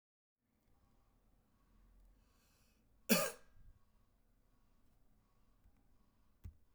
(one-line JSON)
{"cough_length": "6.7 s", "cough_amplitude": 5297, "cough_signal_mean_std_ratio": 0.19, "survey_phase": "beta (2021-08-13 to 2022-03-07)", "age": "18-44", "gender": "Male", "wearing_mask": "No", "symptom_none": true, "smoker_status": "Current smoker (e-cigarettes or vapes only)", "respiratory_condition_asthma": false, "respiratory_condition_other": false, "recruitment_source": "REACT", "submission_delay": "4 days", "covid_test_result": "Negative", "covid_test_method": "RT-qPCR"}